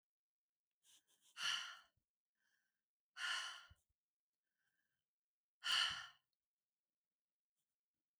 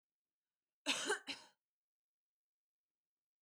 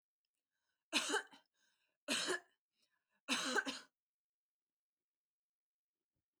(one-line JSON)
{"exhalation_length": "8.2 s", "exhalation_amplitude": 1624, "exhalation_signal_mean_std_ratio": 0.28, "cough_length": "3.4 s", "cough_amplitude": 2263, "cough_signal_mean_std_ratio": 0.26, "three_cough_length": "6.4 s", "three_cough_amplitude": 2528, "three_cough_signal_mean_std_ratio": 0.32, "survey_phase": "beta (2021-08-13 to 2022-03-07)", "age": "18-44", "gender": "Female", "wearing_mask": "No", "symptom_none": true, "smoker_status": "Never smoked", "respiratory_condition_asthma": false, "respiratory_condition_other": false, "recruitment_source": "REACT", "submission_delay": "1 day", "covid_test_result": "Negative", "covid_test_method": "RT-qPCR", "influenza_a_test_result": "Negative", "influenza_b_test_result": "Negative"}